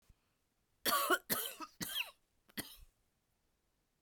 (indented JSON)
{
  "cough_length": "4.0 s",
  "cough_amplitude": 4427,
  "cough_signal_mean_std_ratio": 0.36,
  "survey_phase": "beta (2021-08-13 to 2022-03-07)",
  "age": "45-64",
  "gender": "Female",
  "wearing_mask": "No",
  "symptom_cough_any": true,
  "symptom_sore_throat": true,
  "symptom_onset": "6 days",
  "smoker_status": "Never smoked",
  "respiratory_condition_asthma": false,
  "respiratory_condition_other": false,
  "recruitment_source": "Test and Trace",
  "submission_delay": "1 day",
  "covid_test_result": "Negative",
  "covid_test_method": "RT-qPCR"
}